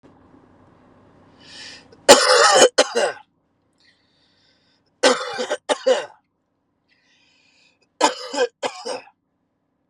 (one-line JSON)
{"three_cough_length": "9.9 s", "three_cough_amplitude": 32768, "three_cough_signal_mean_std_ratio": 0.33, "survey_phase": "beta (2021-08-13 to 2022-03-07)", "age": "18-44", "gender": "Male", "wearing_mask": "No", "symptom_none": true, "smoker_status": "Ex-smoker", "respiratory_condition_asthma": false, "respiratory_condition_other": false, "recruitment_source": "REACT", "submission_delay": "1 day", "covid_test_result": "Negative", "covid_test_method": "RT-qPCR"}